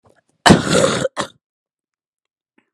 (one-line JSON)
{"cough_length": "2.7 s", "cough_amplitude": 32768, "cough_signal_mean_std_ratio": 0.34, "survey_phase": "alpha (2021-03-01 to 2021-08-12)", "age": "18-44", "gender": "Female", "wearing_mask": "No", "symptom_cough_any": true, "symptom_fatigue": true, "symptom_fever_high_temperature": true, "smoker_status": "Never smoked", "respiratory_condition_asthma": false, "respiratory_condition_other": false, "recruitment_source": "Test and Trace", "submission_delay": "0 days", "covid_test_result": "Positive", "covid_test_method": "LFT"}